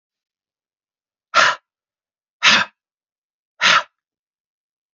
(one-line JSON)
{"exhalation_length": "4.9 s", "exhalation_amplitude": 32767, "exhalation_signal_mean_std_ratio": 0.28, "survey_phase": "beta (2021-08-13 to 2022-03-07)", "age": "45-64", "gender": "Male", "wearing_mask": "No", "symptom_cough_any": true, "symptom_runny_or_blocked_nose": true, "symptom_fatigue": true, "symptom_fever_high_temperature": true, "symptom_headache": true, "symptom_change_to_sense_of_smell_or_taste": true, "symptom_loss_of_taste": true, "symptom_onset": "3 days", "smoker_status": "Never smoked", "respiratory_condition_asthma": false, "respiratory_condition_other": false, "recruitment_source": "Test and Trace", "submission_delay": "2 days", "covid_test_result": "Positive", "covid_test_method": "RT-qPCR", "covid_ct_value": 16.0, "covid_ct_gene": "ORF1ab gene", "covid_ct_mean": 16.6, "covid_viral_load": "3600000 copies/ml", "covid_viral_load_category": "High viral load (>1M copies/ml)"}